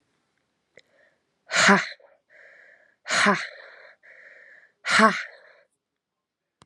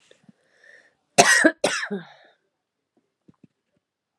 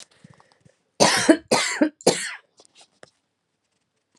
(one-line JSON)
{"exhalation_length": "6.7 s", "exhalation_amplitude": 28659, "exhalation_signal_mean_std_ratio": 0.31, "cough_length": "4.2 s", "cough_amplitude": 32767, "cough_signal_mean_std_ratio": 0.27, "three_cough_length": "4.2 s", "three_cough_amplitude": 29780, "three_cough_signal_mean_std_ratio": 0.34, "survey_phase": "alpha (2021-03-01 to 2021-08-12)", "age": "18-44", "gender": "Female", "wearing_mask": "No", "symptom_cough_any": true, "symptom_shortness_of_breath": true, "symptom_diarrhoea": true, "symptom_fatigue": true, "symptom_headache": true, "symptom_change_to_sense_of_smell_or_taste": true, "symptom_loss_of_taste": true, "symptom_onset": "3 days", "smoker_status": "Ex-smoker", "respiratory_condition_asthma": true, "respiratory_condition_other": false, "recruitment_source": "Test and Trace", "submission_delay": "2 days", "covid_test_result": "Positive", "covid_test_method": "RT-qPCR", "covid_ct_value": 20.5, "covid_ct_gene": "ORF1ab gene", "covid_ct_mean": 21.1, "covid_viral_load": "120000 copies/ml", "covid_viral_load_category": "Low viral load (10K-1M copies/ml)"}